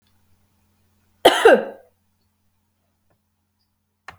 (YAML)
cough_length: 4.2 s
cough_amplitude: 32768
cough_signal_mean_std_ratio: 0.21
survey_phase: beta (2021-08-13 to 2022-03-07)
age: 45-64
gender: Female
wearing_mask: 'No'
symptom_none: true
smoker_status: Never smoked
respiratory_condition_asthma: false
respiratory_condition_other: false
recruitment_source: REACT
submission_delay: 1 day
covid_test_result: Negative
covid_test_method: RT-qPCR
influenza_a_test_result: Negative
influenza_b_test_result: Negative